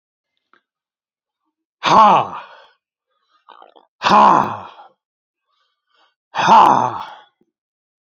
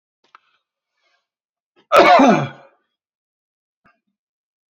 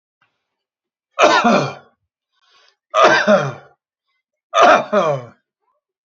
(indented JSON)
{
  "exhalation_length": "8.2 s",
  "exhalation_amplitude": 31121,
  "exhalation_signal_mean_std_ratio": 0.34,
  "cough_length": "4.7 s",
  "cough_amplitude": 29704,
  "cough_signal_mean_std_ratio": 0.27,
  "three_cough_length": "6.1 s",
  "three_cough_amplitude": 30871,
  "three_cough_signal_mean_std_ratio": 0.42,
  "survey_phase": "beta (2021-08-13 to 2022-03-07)",
  "age": "65+",
  "gender": "Male",
  "wearing_mask": "No",
  "symptom_none": true,
  "smoker_status": "Ex-smoker",
  "respiratory_condition_asthma": false,
  "respiratory_condition_other": false,
  "recruitment_source": "REACT",
  "submission_delay": "3 days",
  "covid_test_result": "Negative",
  "covid_test_method": "RT-qPCR",
  "influenza_a_test_result": "Negative",
  "influenza_b_test_result": "Negative"
}